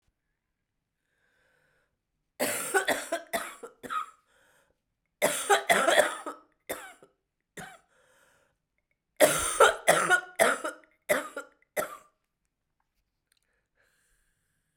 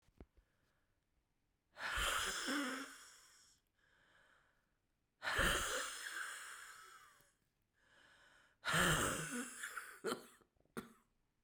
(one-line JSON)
{"cough_length": "14.8 s", "cough_amplitude": 16848, "cough_signal_mean_std_ratio": 0.34, "exhalation_length": "11.4 s", "exhalation_amplitude": 2928, "exhalation_signal_mean_std_ratio": 0.46, "survey_phase": "beta (2021-08-13 to 2022-03-07)", "age": "65+", "gender": "Female", "wearing_mask": "No", "symptom_cough_any": true, "symptom_new_continuous_cough": true, "symptom_runny_or_blocked_nose": true, "symptom_shortness_of_breath": true, "symptom_sore_throat": true, "symptom_fatigue": true, "symptom_onset": "3 days", "smoker_status": "Never smoked", "respiratory_condition_asthma": true, "respiratory_condition_other": false, "recruitment_source": "Test and Trace", "submission_delay": "2 days", "covid_test_result": "Positive", "covid_test_method": "RT-qPCR", "covid_ct_value": 31.7, "covid_ct_gene": "ORF1ab gene"}